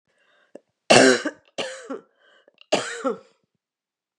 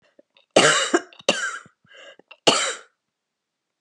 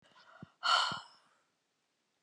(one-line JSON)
{"three_cough_length": "4.2 s", "three_cough_amplitude": 32768, "three_cough_signal_mean_std_ratio": 0.3, "cough_length": "3.8 s", "cough_amplitude": 31785, "cough_signal_mean_std_ratio": 0.37, "exhalation_length": "2.2 s", "exhalation_amplitude": 5376, "exhalation_signal_mean_std_ratio": 0.32, "survey_phase": "beta (2021-08-13 to 2022-03-07)", "age": "45-64", "gender": "Female", "wearing_mask": "No", "symptom_change_to_sense_of_smell_or_taste": true, "symptom_loss_of_taste": true, "symptom_onset": "5 days", "smoker_status": "Never smoked", "respiratory_condition_asthma": false, "respiratory_condition_other": false, "recruitment_source": "REACT", "submission_delay": "0 days", "covid_test_result": "Positive", "covid_test_method": "RT-qPCR", "covid_ct_value": 32.0, "covid_ct_gene": "E gene", "influenza_a_test_result": "Negative", "influenza_b_test_result": "Negative"}